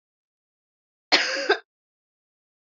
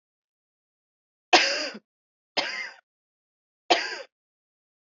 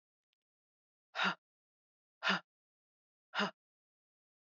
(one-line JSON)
{"cough_length": "2.7 s", "cough_amplitude": 25218, "cough_signal_mean_std_ratio": 0.28, "three_cough_length": "4.9 s", "three_cough_amplitude": 24934, "three_cough_signal_mean_std_ratio": 0.27, "exhalation_length": "4.4 s", "exhalation_amplitude": 3371, "exhalation_signal_mean_std_ratio": 0.25, "survey_phase": "beta (2021-08-13 to 2022-03-07)", "age": "18-44", "gender": "Female", "wearing_mask": "No", "symptom_cough_any": true, "symptom_runny_or_blocked_nose": true, "symptom_headache": true, "smoker_status": "Never smoked", "respiratory_condition_asthma": false, "respiratory_condition_other": false, "recruitment_source": "Test and Trace", "submission_delay": "1 day", "covid_test_result": "Positive", "covid_test_method": "RT-qPCR", "covid_ct_value": 32.2, "covid_ct_gene": "ORF1ab gene"}